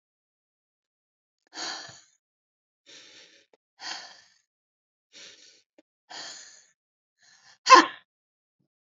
{"exhalation_length": "8.9 s", "exhalation_amplitude": 28535, "exhalation_signal_mean_std_ratio": 0.15, "survey_phase": "beta (2021-08-13 to 2022-03-07)", "age": "65+", "gender": "Female", "wearing_mask": "No", "symptom_none": true, "smoker_status": "Never smoked", "respiratory_condition_asthma": false, "respiratory_condition_other": false, "recruitment_source": "REACT", "submission_delay": "1 day", "covid_test_result": "Negative", "covid_test_method": "RT-qPCR", "influenza_a_test_result": "Unknown/Void", "influenza_b_test_result": "Unknown/Void"}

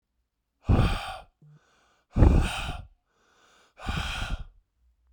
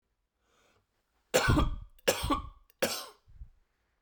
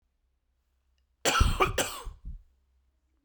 {"exhalation_length": "5.1 s", "exhalation_amplitude": 20056, "exhalation_signal_mean_std_ratio": 0.38, "three_cough_length": "4.0 s", "three_cough_amplitude": 9071, "three_cough_signal_mean_std_ratio": 0.39, "cough_length": "3.2 s", "cough_amplitude": 11426, "cough_signal_mean_std_ratio": 0.37, "survey_phase": "beta (2021-08-13 to 2022-03-07)", "age": "18-44", "gender": "Male", "wearing_mask": "No", "symptom_cough_any": true, "symptom_new_continuous_cough": true, "symptom_runny_or_blocked_nose": true, "symptom_shortness_of_breath": true, "symptom_sore_throat": true, "symptom_abdominal_pain": true, "symptom_fatigue": true, "symptom_fever_high_temperature": true, "symptom_headache": true, "symptom_other": true, "smoker_status": "Never smoked", "respiratory_condition_asthma": false, "respiratory_condition_other": false, "recruitment_source": "Test and Trace", "submission_delay": "1 day", "covid_test_result": "Positive", "covid_test_method": "LFT"}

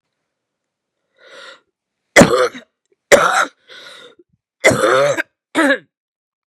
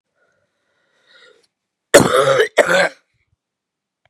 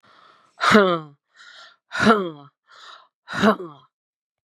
{"three_cough_length": "6.5 s", "three_cough_amplitude": 32768, "three_cough_signal_mean_std_ratio": 0.37, "cough_length": "4.1 s", "cough_amplitude": 32768, "cough_signal_mean_std_ratio": 0.34, "exhalation_length": "4.4 s", "exhalation_amplitude": 31538, "exhalation_signal_mean_std_ratio": 0.36, "survey_phase": "beta (2021-08-13 to 2022-03-07)", "age": "65+", "gender": "Female", "wearing_mask": "No", "symptom_cough_any": true, "symptom_sore_throat": true, "symptom_onset": "4 days", "smoker_status": "Never smoked", "respiratory_condition_asthma": false, "respiratory_condition_other": false, "recruitment_source": "Test and Trace", "submission_delay": "2 days", "covid_test_result": "Negative", "covid_test_method": "RT-qPCR"}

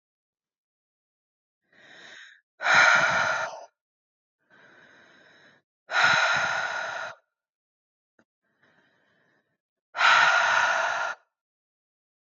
{"exhalation_length": "12.3 s", "exhalation_amplitude": 16078, "exhalation_signal_mean_std_ratio": 0.4, "survey_phase": "beta (2021-08-13 to 2022-03-07)", "age": "18-44", "gender": "Female", "wearing_mask": "No", "symptom_sore_throat": true, "symptom_fatigue": true, "symptom_headache": true, "symptom_onset": "5 days", "smoker_status": "Ex-smoker", "respiratory_condition_asthma": false, "respiratory_condition_other": false, "recruitment_source": "Test and Trace", "submission_delay": "1 day", "covid_test_result": "Positive", "covid_test_method": "RT-qPCR", "covid_ct_value": 32.9, "covid_ct_gene": "N gene"}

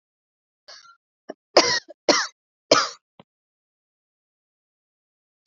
{"three_cough_length": "5.5 s", "three_cough_amplitude": 29546, "three_cough_signal_mean_std_ratio": 0.23, "survey_phase": "beta (2021-08-13 to 2022-03-07)", "age": "18-44", "gender": "Female", "wearing_mask": "No", "symptom_cough_any": true, "symptom_runny_or_blocked_nose": true, "symptom_shortness_of_breath": true, "symptom_sore_throat": true, "symptom_fatigue": true, "symptom_fever_high_temperature": true, "symptom_headache": true, "symptom_onset": "2 days", "smoker_status": "Never smoked", "respiratory_condition_asthma": false, "respiratory_condition_other": false, "recruitment_source": "Test and Trace", "submission_delay": "2 days", "covid_test_result": "Positive", "covid_test_method": "RT-qPCR", "covid_ct_value": 25.8, "covid_ct_gene": "ORF1ab gene", "covid_ct_mean": 26.2, "covid_viral_load": "2500 copies/ml", "covid_viral_load_category": "Minimal viral load (< 10K copies/ml)"}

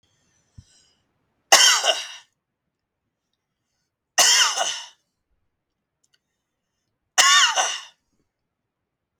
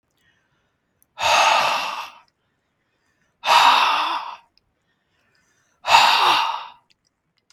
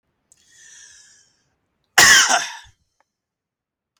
{"three_cough_length": "9.2 s", "three_cough_amplitude": 32768, "three_cough_signal_mean_std_ratio": 0.32, "exhalation_length": "7.5 s", "exhalation_amplitude": 32192, "exhalation_signal_mean_std_ratio": 0.45, "cough_length": "4.0 s", "cough_amplitude": 32767, "cough_signal_mean_std_ratio": 0.27, "survey_phase": "beta (2021-08-13 to 2022-03-07)", "age": "45-64", "gender": "Male", "wearing_mask": "No", "symptom_none": true, "smoker_status": "Ex-smoker", "respiratory_condition_asthma": false, "respiratory_condition_other": false, "recruitment_source": "REACT", "submission_delay": "11 days", "covid_test_result": "Negative", "covid_test_method": "RT-qPCR", "influenza_a_test_result": "Negative", "influenza_b_test_result": "Negative"}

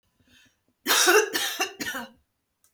{"cough_length": "2.7 s", "cough_amplitude": 19056, "cough_signal_mean_std_ratio": 0.44, "survey_phase": "beta (2021-08-13 to 2022-03-07)", "age": "18-44", "gender": "Female", "wearing_mask": "No", "symptom_none": true, "smoker_status": "Ex-smoker", "respiratory_condition_asthma": false, "respiratory_condition_other": false, "recruitment_source": "REACT", "submission_delay": "1 day", "covid_test_result": "Negative", "covid_test_method": "RT-qPCR"}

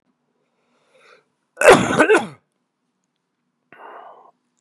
{"cough_length": "4.6 s", "cough_amplitude": 32768, "cough_signal_mean_std_ratio": 0.27, "survey_phase": "beta (2021-08-13 to 2022-03-07)", "age": "45-64", "gender": "Male", "wearing_mask": "No", "symptom_cough_any": true, "symptom_runny_or_blocked_nose": true, "symptom_headache": true, "symptom_change_to_sense_of_smell_or_taste": true, "symptom_loss_of_taste": true, "symptom_onset": "3 days", "smoker_status": "Never smoked", "respiratory_condition_asthma": false, "respiratory_condition_other": false, "recruitment_source": "Test and Trace", "submission_delay": "1 day", "covid_test_result": "Positive", "covid_test_method": "RT-qPCR"}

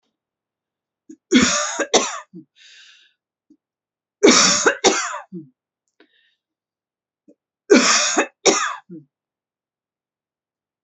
{"three_cough_length": "10.8 s", "three_cough_amplitude": 32768, "three_cough_signal_mean_std_ratio": 0.35, "survey_phase": "alpha (2021-03-01 to 2021-08-12)", "age": "18-44", "gender": "Female", "wearing_mask": "No", "symptom_cough_any": true, "symptom_shortness_of_breath": true, "symptom_fatigue": true, "symptom_change_to_sense_of_smell_or_taste": true, "symptom_loss_of_taste": true, "symptom_onset": "7 days", "smoker_status": "Ex-smoker", "respiratory_condition_asthma": false, "respiratory_condition_other": false, "recruitment_source": "Test and Trace", "submission_delay": "2 days", "covid_test_result": "Positive", "covid_test_method": "RT-qPCR", "covid_ct_value": 18.9, "covid_ct_gene": "ORF1ab gene", "covid_ct_mean": 19.3, "covid_viral_load": "470000 copies/ml", "covid_viral_load_category": "Low viral load (10K-1M copies/ml)"}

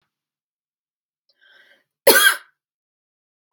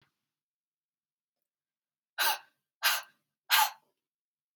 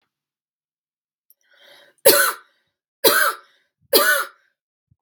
{"cough_length": "3.5 s", "cough_amplitude": 32768, "cough_signal_mean_std_ratio": 0.22, "exhalation_length": "4.6 s", "exhalation_amplitude": 9543, "exhalation_signal_mean_std_ratio": 0.27, "three_cough_length": "5.0 s", "three_cough_amplitude": 32768, "three_cough_signal_mean_std_ratio": 0.33, "survey_phase": "beta (2021-08-13 to 2022-03-07)", "age": "18-44", "gender": "Female", "wearing_mask": "No", "symptom_runny_or_blocked_nose": true, "symptom_change_to_sense_of_smell_or_taste": true, "symptom_loss_of_taste": true, "symptom_onset": "3 days", "smoker_status": "Never smoked", "respiratory_condition_asthma": false, "respiratory_condition_other": false, "recruitment_source": "Test and Trace", "submission_delay": "1 day", "covid_test_result": "Positive", "covid_test_method": "RT-qPCR", "covid_ct_value": 22.6, "covid_ct_gene": "S gene", "covid_ct_mean": 22.8, "covid_viral_load": "33000 copies/ml", "covid_viral_load_category": "Low viral load (10K-1M copies/ml)"}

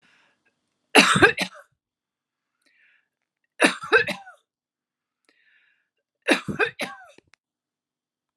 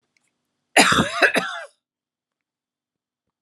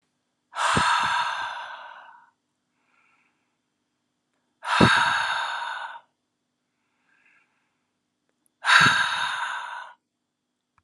{"three_cough_length": "8.4 s", "three_cough_amplitude": 30595, "three_cough_signal_mean_std_ratio": 0.26, "cough_length": "3.4 s", "cough_amplitude": 30801, "cough_signal_mean_std_ratio": 0.33, "exhalation_length": "10.8 s", "exhalation_amplitude": 27042, "exhalation_signal_mean_std_ratio": 0.42, "survey_phase": "alpha (2021-03-01 to 2021-08-12)", "age": "65+", "gender": "Female", "wearing_mask": "No", "symptom_none": true, "smoker_status": "Never smoked", "respiratory_condition_asthma": false, "respiratory_condition_other": false, "recruitment_source": "REACT", "submission_delay": "1 day", "covid_test_result": "Negative", "covid_test_method": "RT-qPCR"}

